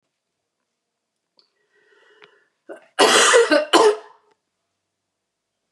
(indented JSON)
{
  "cough_length": "5.7 s",
  "cough_amplitude": 30179,
  "cough_signal_mean_std_ratio": 0.33,
  "survey_phase": "beta (2021-08-13 to 2022-03-07)",
  "age": "45-64",
  "gender": "Female",
  "wearing_mask": "No",
  "symptom_none": true,
  "smoker_status": "Never smoked",
  "respiratory_condition_asthma": false,
  "respiratory_condition_other": false,
  "recruitment_source": "REACT",
  "submission_delay": "1 day",
  "covid_test_result": "Negative",
  "covid_test_method": "RT-qPCR",
  "influenza_a_test_result": "Negative",
  "influenza_b_test_result": "Negative"
}